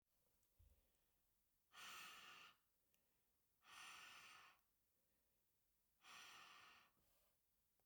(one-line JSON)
{"exhalation_length": "7.9 s", "exhalation_amplitude": 140, "exhalation_signal_mean_std_ratio": 0.56, "survey_phase": "beta (2021-08-13 to 2022-03-07)", "age": "45-64", "gender": "Female", "wearing_mask": "No", "symptom_cough_any": true, "symptom_runny_or_blocked_nose": true, "symptom_sore_throat": true, "smoker_status": "Never smoked", "respiratory_condition_asthma": false, "respiratory_condition_other": false, "recruitment_source": "Test and Trace", "submission_delay": "0 days", "covid_test_result": "Positive", "covid_test_method": "LFT"}